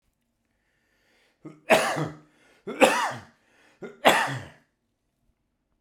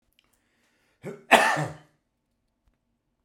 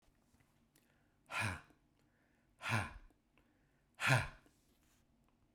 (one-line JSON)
{"three_cough_length": "5.8 s", "three_cough_amplitude": 30219, "three_cough_signal_mean_std_ratio": 0.32, "cough_length": "3.2 s", "cough_amplitude": 27472, "cough_signal_mean_std_ratio": 0.25, "exhalation_length": "5.5 s", "exhalation_amplitude": 4775, "exhalation_signal_mean_std_ratio": 0.3, "survey_phase": "beta (2021-08-13 to 2022-03-07)", "age": "65+", "gender": "Male", "wearing_mask": "No", "symptom_none": true, "smoker_status": "Never smoked", "respiratory_condition_asthma": false, "respiratory_condition_other": false, "recruitment_source": "REACT", "submission_delay": "2 days", "covid_test_result": "Negative", "covid_test_method": "RT-qPCR"}